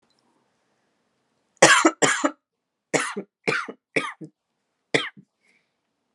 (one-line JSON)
{"cough_length": "6.1 s", "cough_amplitude": 32768, "cough_signal_mean_std_ratio": 0.3, "survey_phase": "alpha (2021-03-01 to 2021-08-12)", "age": "18-44", "gender": "Female", "wearing_mask": "No", "symptom_cough_any": true, "symptom_headache": true, "smoker_status": "Never smoked", "respiratory_condition_asthma": false, "respiratory_condition_other": false, "recruitment_source": "Test and Trace", "submission_delay": "2 days", "covid_test_result": "Positive", "covid_test_method": "RT-qPCR", "covid_ct_value": 18.5, "covid_ct_gene": "ORF1ab gene", "covid_ct_mean": 19.7, "covid_viral_load": "340000 copies/ml", "covid_viral_load_category": "Low viral load (10K-1M copies/ml)"}